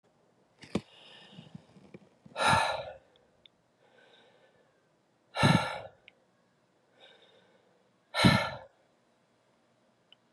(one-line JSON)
{"exhalation_length": "10.3 s", "exhalation_amplitude": 14744, "exhalation_signal_mean_std_ratio": 0.28, "survey_phase": "beta (2021-08-13 to 2022-03-07)", "age": "45-64", "gender": "Female", "wearing_mask": "No", "symptom_cough_any": true, "symptom_runny_or_blocked_nose": true, "symptom_sore_throat": true, "symptom_fatigue": true, "symptom_fever_high_temperature": true, "symptom_headache": true, "symptom_onset": "3 days", "smoker_status": "Never smoked", "respiratory_condition_asthma": false, "respiratory_condition_other": false, "recruitment_source": "Test and Trace", "submission_delay": "1 day", "covid_test_result": "Positive", "covid_test_method": "RT-qPCR"}